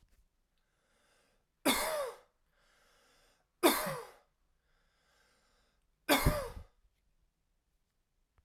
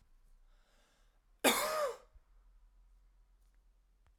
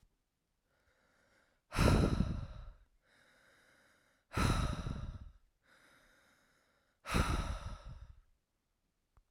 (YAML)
three_cough_length: 8.4 s
three_cough_amplitude: 8286
three_cough_signal_mean_std_ratio: 0.28
cough_length: 4.2 s
cough_amplitude: 6479
cough_signal_mean_std_ratio: 0.3
exhalation_length: 9.3 s
exhalation_amplitude: 5979
exhalation_signal_mean_std_ratio: 0.38
survey_phase: alpha (2021-03-01 to 2021-08-12)
age: 18-44
gender: Male
wearing_mask: 'No'
symptom_cough_any: true
symptom_abdominal_pain: true
symptom_fatigue: true
symptom_headache: true
symptom_onset: 3 days
smoker_status: Current smoker (e-cigarettes or vapes only)
respiratory_condition_asthma: false
respiratory_condition_other: false
recruitment_source: Test and Trace
submission_delay: 2 days
covid_test_result: Positive
covid_test_method: RT-qPCR
covid_ct_value: 21.7
covid_ct_gene: ORF1ab gene